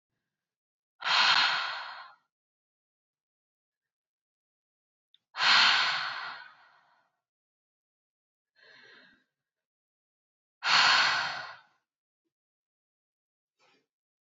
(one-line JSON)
{"exhalation_length": "14.3 s", "exhalation_amplitude": 13427, "exhalation_signal_mean_std_ratio": 0.32, "survey_phase": "beta (2021-08-13 to 2022-03-07)", "age": "18-44", "gender": "Female", "wearing_mask": "No", "symptom_sore_throat": true, "symptom_fatigue": true, "symptom_headache": true, "symptom_change_to_sense_of_smell_or_taste": true, "symptom_loss_of_taste": true, "symptom_other": true, "smoker_status": "Never smoked", "respiratory_condition_asthma": true, "respiratory_condition_other": false, "recruitment_source": "Test and Trace", "submission_delay": "2 days", "covid_test_result": "Positive", "covid_test_method": "LFT"}